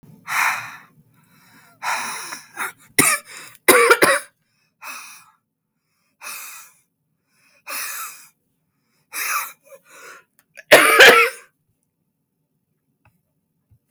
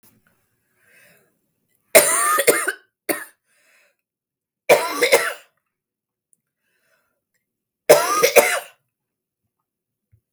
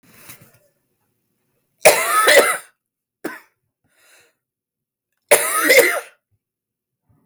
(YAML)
exhalation_length: 13.9 s
exhalation_amplitude: 32768
exhalation_signal_mean_std_ratio: 0.31
three_cough_length: 10.3 s
three_cough_amplitude: 32768
three_cough_signal_mean_std_ratio: 0.31
cough_length: 7.3 s
cough_amplitude: 32768
cough_signal_mean_std_ratio: 0.34
survey_phase: beta (2021-08-13 to 2022-03-07)
age: 18-44
gender: Female
wearing_mask: 'No'
symptom_cough_any: true
symptom_runny_or_blocked_nose: true
symptom_fatigue: true
symptom_other: true
symptom_onset: 12 days
smoker_status: Prefer not to say
respiratory_condition_asthma: false
respiratory_condition_other: false
recruitment_source: REACT
submission_delay: 3 days
covid_test_result: Negative
covid_test_method: RT-qPCR
influenza_a_test_result: Unknown/Void
influenza_b_test_result: Unknown/Void